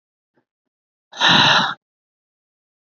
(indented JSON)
{
  "exhalation_length": "2.9 s",
  "exhalation_amplitude": 27251,
  "exhalation_signal_mean_std_ratio": 0.35,
  "survey_phase": "beta (2021-08-13 to 2022-03-07)",
  "age": "45-64",
  "gender": "Female",
  "wearing_mask": "No",
  "symptom_cough_any": true,
  "symptom_runny_or_blocked_nose": true,
  "symptom_shortness_of_breath": true,
  "symptom_diarrhoea": true,
  "symptom_fatigue": true,
  "symptom_headache": true,
  "symptom_change_to_sense_of_smell_or_taste": true,
  "symptom_loss_of_taste": true,
  "symptom_onset": "3 days",
  "smoker_status": "Never smoked",
  "respiratory_condition_asthma": false,
  "respiratory_condition_other": false,
  "recruitment_source": "Test and Trace",
  "submission_delay": "2 days",
  "covid_test_result": "Positive",
  "covid_test_method": "RT-qPCR"
}